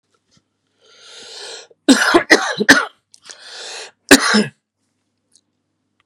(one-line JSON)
{"cough_length": "6.1 s", "cough_amplitude": 32768, "cough_signal_mean_std_ratio": 0.33, "survey_phase": "beta (2021-08-13 to 2022-03-07)", "age": "45-64", "gender": "Male", "wearing_mask": "No", "symptom_cough_any": true, "symptom_onset": "10 days", "smoker_status": "Never smoked", "respiratory_condition_asthma": false, "respiratory_condition_other": false, "recruitment_source": "Test and Trace", "submission_delay": "2 days", "covid_test_result": "Positive", "covid_test_method": "RT-qPCR", "covid_ct_value": 19.9, "covid_ct_gene": "ORF1ab gene", "covid_ct_mean": 20.7, "covid_viral_load": "160000 copies/ml", "covid_viral_load_category": "Low viral load (10K-1M copies/ml)"}